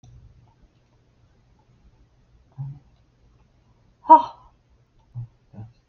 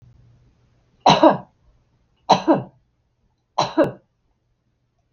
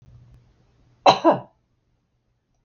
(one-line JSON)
{"exhalation_length": "5.9 s", "exhalation_amplitude": 31902, "exhalation_signal_mean_std_ratio": 0.16, "three_cough_length": "5.1 s", "three_cough_amplitude": 32768, "three_cough_signal_mean_std_ratio": 0.29, "cough_length": "2.6 s", "cough_amplitude": 32766, "cough_signal_mean_std_ratio": 0.24, "survey_phase": "beta (2021-08-13 to 2022-03-07)", "age": "65+", "gender": "Female", "wearing_mask": "No", "symptom_none": true, "smoker_status": "Never smoked", "respiratory_condition_asthma": false, "respiratory_condition_other": false, "recruitment_source": "REACT", "submission_delay": "1 day", "covid_test_result": "Negative", "covid_test_method": "RT-qPCR", "influenza_a_test_result": "Negative", "influenza_b_test_result": "Negative"}